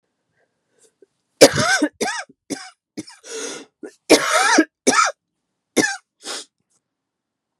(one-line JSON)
{"three_cough_length": "7.6 s", "three_cough_amplitude": 32768, "three_cough_signal_mean_std_ratio": 0.35, "survey_phase": "beta (2021-08-13 to 2022-03-07)", "age": "45-64", "gender": "Female", "wearing_mask": "No", "symptom_cough_any": true, "symptom_runny_or_blocked_nose": true, "symptom_sore_throat": true, "symptom_abdominal_pain": true, "symptom_diarrhoea": true, "symptom_fatigue": true, "symptom_other": true, "symptom_onset": "3 days", "smoker_status": "Ex-smoker", "respiratory_condition_asthma": false, "respiratory_condition_other": false, "recruitment_source": "Test and Trace", "submission_delay": "1 day", "covid_test_result": "Positive", "covid_test_method": "ePCR"}